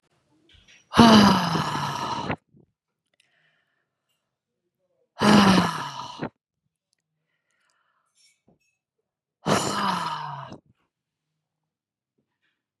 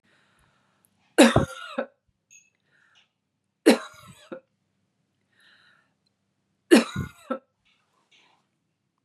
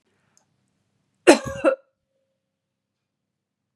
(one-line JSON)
{"exhalation_length": "12.8 s", "exhalation_amplitude": 32424, "exhalation_signal_mean_std_ratio": 0.33, "three_cough_length": "9.0 s", "three_cough_amplitude": 30447, "three_cough_signal_mean_std_ratio": 0.21, "cough_length": "3.8 s", "cough_amplitude": 32768, "cough_signal_mean_std_ratio": 0.19, "survey_phase": "beta (2021-08-13 to 2022-03-07)", "age": "18-44", "gender": "Female", "wearing_mask": "No", "symptom_none": true, "smoker_status": "Ex-smoker", "respiratory_condition_asthma": false, "respiratory_condition_other": false, "recruitment_source": "REACT", "submission_delay": "1 day", "covid_test_result": "Negative", "covid_test_method": "RT-qPCR", "influenza_a_test_result": "Negative", "influenza_b_test_result": "Negative"}